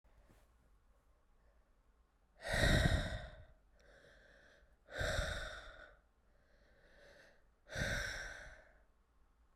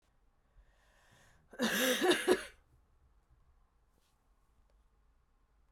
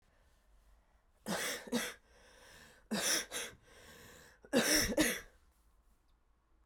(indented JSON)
{
  "exhalation_length": "9.6 s",
  "exhalation_amplitude": 3971,
  "exhalation_signal_mean_std_ratio": 0.38,
  "cough_length": "5.7 s",
  "cough_amplitude": 6808,
  "cough_signal_mean_std_ratio": 0.31,
  "three_cough_length": "6.7 s",
  "three_cough_amplitude": 5435,
  "three_cough_signal_mean_std_ratio": 0.42,
  "survey_phase": "beta (2021-08-13 to 2022-03-07)",
  "age": "18-44",
  "gender": "Female",
  "wearing_mask": "No",
  "symptom_cough_any": true,
  "symptom_runny_or_blocked_nose": true,
  "symptom_sore_throat": true,
  "symptom_fatigue": true,
  "symptom_headache": true,
  "symptom_change_to_sense_of_smell_or_taste": true,
  "symptom_loss_of_taste": true,
  "symptom_onset": "3 days",
  "smoker_status": "Never smoked",
  "respiratory_condition_asthma": false,
  "respiratory_condition_other": false,
  "recruitment_source": "Test and Trace",
  "submission_delay": "1 day",
  "covid_test_result": "Positive",
  "covid_test_method": "RT-qPCR"
}